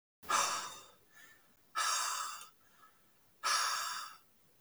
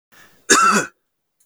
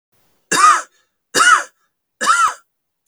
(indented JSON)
{
  "exhalation_length": "4.6 s",
  "exhalation_amplitude": 3659,
  "exhalation_signal_mean_std_ratio": 0.54,
  "cough_length": "1.5 s",
  "cough_amplitude": 32768,
  "cough_signal_mean_std_ratio": 0.43,
  "three_cough_length": "3.1 s",
  "three_cough_amplitude": 32768,
  "three_cough_signal_mean_std_ratio": 0.45,
  "survey_phase": "beta (2021-08-13 to 2022-03-07)",
  "age": "18-44",
  "gender": "Male",
  "wearing_mask": "No",
  "symptom_none": true,
  "smoker_status": "Ex-smoker",
  "respiratory_condition_asthma": false,
  "respiratory_condition_other": false,
  "recruitment_source": "REACT",
  "submission_delay": "1 day",
  "covid_test_result": "Negative",
  "covid_test_method": "RT-qPCR",
  "influenza_a_test_result": "Negative",
  "influenza_b_test_result": "Negative"
}